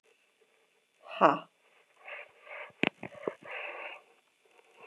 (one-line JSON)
{"exhalation_length": "4.9 s", "exhalation_amplitude": 15057, "exhalation_signal_mean_std_ratio": 0.25, "survey_phase": "beta (2021-08-13 to 2022-03-07)", "age": "45-64", "gender": "Female", "wearing_mask": "No", "symptom_cough_any": true, "symptom_runny_or_blocked_nose": true, "symptom_shortness_of_breath": true, "symptom_fatigue": true, "symptom_headache": true, "symptom_change_to_sense_of_smell_or_taste": true, "symptom_onset": "3 days", "smoker_status": "Never smoked", "respiratory_condition_asthma": false, "respiratory_condition_other": false, "recruitment_source": "Test and Trace", "submission_delay": "1 day", "covid_test_result": "Positive", "covid_test_method": "RT-qPCR", "covid_ct_value": 27.7, "covid_ct_gene": "N gene"}